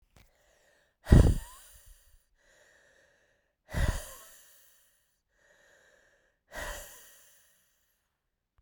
{
  "exhalation_length": "8.6 s",
  "exhalation_amplitude": 20806,
  "exhalation_signal_mean_std_ratio": 0.2,
  "survey_phase": "beta (2021-08-13 to 2022-03-07)",
  "age": "18-44",
  "gender": "Female",
  "wearing_mask": "No",
  "symptom_cough_any": true,
  "symptom_runny_or_blocked_nose": true,
  "symptom_headache": true,
  "symptom_change_to_sense_of_smell_or_taste": true,
  "symptom_loss_of_taste": true,
  "symptom_other": true,
  "smoker_status": "Current smoker (e-cigarettes or vapes only)",
  "respiratory_condition_asthma": false,
  "respiratory_condition_other": false,
  "recruitment_source": "Test and Trace",
  "submission_delay": "2 days",
  "covid_test_result": "Positive",
  "covid_test_method": "RT-qPCR",
  "covid_ct_value": 18.0,
  "covid_ct_gene": "ORF1ab gene",
  "covid_ct_mean": 18.4,
  "covid_viral_load": "920000 copies/ml",
  "covid_viral_load_category": "Low viral load (10K-1M copies/ml)"
}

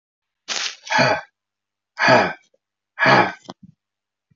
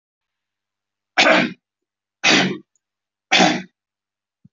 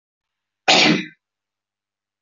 {
  "exhalation_length": "4.4 s",
  "exhalation_amplitude": 25274,
  "exhalation_signal_mean_std_ratio": 0.4,
  "three_cough_length": "4.5 s",
  "three_cough_amplitude": 28061,
  "three_cough_signal_mean_std_ratio": 0.36,
  "cough_length": "2.2 s",
  "cough_amplitude": 29221,
  "cough_signal_mean_std_ratio": 0.32,
  "survey_phase": "beta (2021-08-13 to 2022-03-07)",
  "age": "45-64",
  "gender": "Male",
  "wearing_mask": "No",
  "symptom_none": true,
  "symptom_onset": "4 days",
  "smoker_status": "Never smoked",
  "respiratory_condition_asthma": false,
  "respiratory_condition_other": false,
  "recruitment_source": "REACT",
  "submission_delay": "4 days",
  "covid_test_result": "Negative",
  "covid_test_method": "RT-qPCR"
}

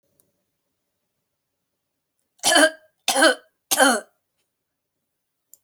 {
  "three_cough_length": "5.6 s",
  "three_cough_amplitude": 28146,
  "three_cough_signal_mean_std_ratio": 0.29,
  "survey_phase": "alpha (2021-03-01 to 2021-08-12)",
  "age": "45-64",
  "gender": "Female",
  "wearing_mask": "No",
  "symptom_none": true,
  "smoker_status": "Never smoked",
  "respiratory_condition_asthma": false,
  "respiratory_condition_other": false,
  "recruitment_source": "REACT",
  "submission_delay": "2 days",
  "covid_test_result": "Negative",
  "covid_test_method": "RT-qPCR"
}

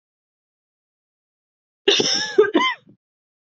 {
  "cough_length": "3.6 s",
  "cough_amplitude": 27161,
  "cough_signal_mean_std_ratio": 0.34,
  "survey_phase": "beta (2021-08-13 to 2022-03-07)",
  "age": "18-44",
  "gender": "Female",
  "wearing_mask": "No",
  "symptom_runny_or_blocked_nose": true,
  "symptom_shortness_of_breath": true,
  "symptom_fatigue": true,
  "symptom_change_to_sense_of_smell_or_taste": true,
  "symptom_onset": "4 days",
  "smoker_status": "Ex-smoker",
  "respiratory_condition_asthma": false,
  "respiratory_condition_other": false,
  "recruitment_source": "Test and Trace",
  "submission_delay": "2 days",
  "covid_test_result": "Positive",
  "covid_test_method": "RT-qPCR",
  "covid_ct_value": 20.8,
  "covid_ct_gene": "ORF1ab gene",
  "covid_ct_mean": 21.6,
  "covid_viral_load": "83000 copies/ml",
  "covid_viral_load_category": "Low viral load (10K-1M copies/ml)"
}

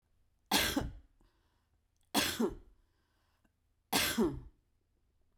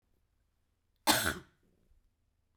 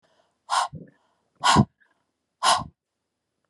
{
  "three_cough_length": "5.4 s",
  "three_cough_amplitude": 6180,
  "three_cough_signal_mean_std_ratio": 0.39,
  "cough_length": "2.6 s",
  "cough_amplitude": 8880,
  "cough_signal_mean_std_ratio": 0.25,
  "exhalation_length": "3.5 s",
  "exhalation_amplitude": 18264,
  "exhalation_signal_mean_std_ratio": 0.32,
  "survey_phase": "beta (2021-08-13 to 2022-03-07)",
  "age": "45-64",
  "gender": "Female",
  "wearing_mask": "No",
  "symptom_fatigue": true,
  "symptom_loss_of_taste": true,
  "symptom_onset": "4 days",
  "smoker_status": "Ex-smoker",
  "respiratory_condition_asthma": false,
  "respiratory_condition_other": false,
  "recruitment_source": "REACT",
  "submission_delay": "0 days",
  "covid_test_result": "Negative",
  "covid_test_method": "RT-qPCR",
  "influenza_a_test_result": "Negative",
  "influenza_b_test_result": "Negative"
}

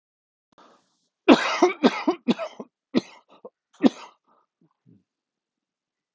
{
  "cough_length": "6.1 s",
  "cough_amplitude": 32766,
  "cough_signal_mean_std_ratio": 0.26,
  "survey_phase": "alpha (2021-03-01 to 2021-08-12)",
  "age": "65+",
  "gender": "Male",
  "wearing_mask": "No",
  "symptom_cough_any": true,
  "symptom_fatigue": true,
  "symptom_headache": true,
  "symptom_onset": "5 days",
  "smoker_status": "Ex-smoker",
  "respiratory_condition_asthma": false,
  "respiratory_condition_other": false,
  "recruitment_source": "Test and Trace",
  "submission_delay": "2 days",
  "covid_test_result": "Positive",
  "covid_test_method": "RT-qPCR",
  "covid_ct_value": 33.3,
  "covid_ct_gene": "ORF1ab gene"
}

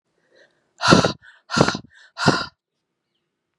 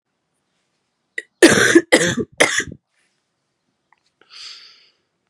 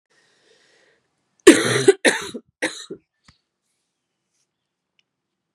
{
  "exhalation_length": "3.6 s",
  "exhalation_amplitude": 32768,
  "exhalation_signal_mean_std_ratio": 0.32,
  "cough_length": "5.3 s",
  "cough_amplitude": 32768,
  "cough_signal_mean_std_ratio": 0.3,
  "three_cough_length": "5.5 s",
  "three_cough_amplitude": 32768,
  "three_cough_signal_mean_std_ratio": 0.23,
  "survey_phase": "beta (2021-08-13 to 2022-03-07)",
  "age": "18-44",
  "gender": "Female",
  "wearing_mask": "No",
  "symptom_new_continuous_cough": true,
  "symptom_runny_or_blocked_nose": true,
  "symptom_sore_throat": true,
  "symptom_fatigue": true,
  "symptom_fever_high_temperature": true,
  "symptom_onset": "2 days",
  "smoker_status": "Ex-smoker",
  "respiratory_condition_asthma": false,
  "respiratory_condition_other": false,
  "recruitment_source": "Test and Trace",
  "submission_delay": "1 day",
  "covid_test_result": "Positive",
  "covid_test_method": "RT-qPCR",
  "covid_ct_value": 19.7,
  "covid_ct_gene": "ORF1ab gene",
  "covid_ct_mean": 20.1,
  "covid_viral_load": "260000 copies/ml",
  "covid_viral_load_category": "Low viral load (10K-1M copies/ml)"
}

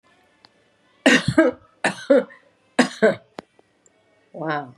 {
  "three_cough_length": "4.8 s",
  "three_cough_amplitude": 29648,
  "three_cough_signal_mean_std_ratio": 0.36,
  "survey_phase": "beta (2021-08-13 to 2022-03-07)",
  "age": "65+",
  "gender": "Female",
  "wearing_mask": "No",
  "symptom_none": true,
  "smoker_status": "Never smoked",
  "respiratory_condition_asthma": false,
  "respiratory_condition_other": false,
  "recruitment_source": "REACT",
  "submission_delay": "1 day",
  "covid_test_result": "Negative",
  "covid_test_method": "RT-qPCR",
  "influenza_a_test_result": "Unknown/Void",
  "influenza_b_test_result": "Unknown/Void"
}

